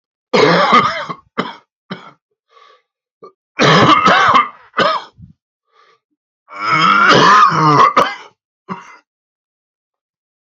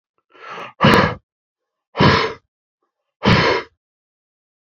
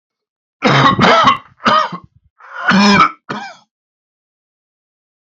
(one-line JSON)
{"three_cough_length": "10.4 s", "three_cough_amplitude": 31758, "three_cough_signal_mean_std_ratio": 0.5, "exhalation_length": "4.8 s", "exhalation_amplitude": 32768, "exhalation_signal_mean_std_ratio": 0.38, "cough_length": "5.2 s", "cough_amplitude": 30718, "cough_signal_mean_std_ratio": 0.48, "survey_phase": "beta (2021-08-13 to 2022-03-07)", "age": "45-64", "gender": "Male", "wearing_mask": "No", "symptom_cough_any": true, "symptom_new_continuous_cough": true, "symptom_runny_or_blocked_nose": true, "symptom_shortness_of_breath": true, "symptom_sore_throat": true, "symptom_fatigue": true, "symptom_headache": true, "symptom_change_to_sense_of_smell_or_taste": true, "symptom_loss_of_taste": true, "symptom_onset": "3 days", "smoker_status": "Never smoked", "respiratory_condition_asthma": false, "respiratory_condition_other": false, "recruitment_source": "Test and Trace", "submission_delay": "1 day", "covid_test_result": "Positive", "covid_test_method": "RT-qPCR", "covid_ct_value": 18.8, "covid_ct_gene": "ORF1ab gene", "covid_ct_mean": 19.7, "covid_viral_load": "340000 copies/ml", "covid_viral_load_category": "Low viral load (10K-1M copies/ml)"}